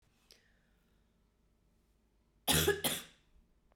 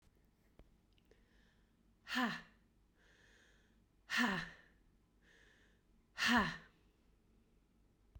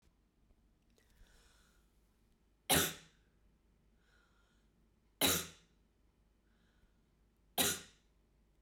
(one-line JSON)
{"cough_length": "3.8 s", "cough_amplitude": 5208, "cough_signal_mean_std_ratio": 0.29, "exhalation_length": "8.2 s", "exhalation_amplitude": 2825, "exhalation_signal_mean_std_ratio": 0.31, "three_cough_length": "8.6 s", "three_cough_amplitude": 4653, "three_cough_signal_mean_std_ratio": 0.24, "survey_phase": "beta (2021-08-13 to 2022-03-07)", "age": "18-44", "gender": "Female", "wearing_mask": "No", "symptom_cough_any": true, "symptom_runny_or_blocked_nose": true, "symptom_diarrhoea": true, "symptom_fatigue": true, "symptom_fever_high_temperature": true, "symptom_change_to_sense_of_smell_or_taste": true, "symptom_loss_of_taste": true, "smoker_status": "Never smoked", "respiratory_condition_asthma": false, "respiratory_condition_other": false, "recruitment_source": "Test and Trace", "submission_delay": "1 day", "covid_test_result": "Positive", "covid_test_method": "RT-qPCR", "covid_ct_value": 27.3, "covid_ct_gene": "ORF1ab gene", "covid_ct_mean": 28.3, "covid_viral_load": "530 copies/ml", "covid_viral_load_category": "Minimal viral load (< 10K copies/ml)"}